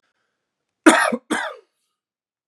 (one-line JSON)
{"cough_length": "2.5 s", "cough_amplitude": 32767, "cough_signal_mean_std_ratio": 0.29, "survey_phase": "beta (2021-08-13 to 2022-03-07)", "age": "18-44", "gender": "Male", "wearing_mask": "No", "symptom_none": true, "smoker_status": "Never smoked", "respiratory_condition_asthma": false, "respiratory_condition_other": false, "recruitment_source": "REACT", "submission_delay": "3 days", "covid_test_result": "Negative", "covid_test_method": "RT-qPCR", "influenza_a_test_result": "Negative", "influenza_b_test_result": "Negative"}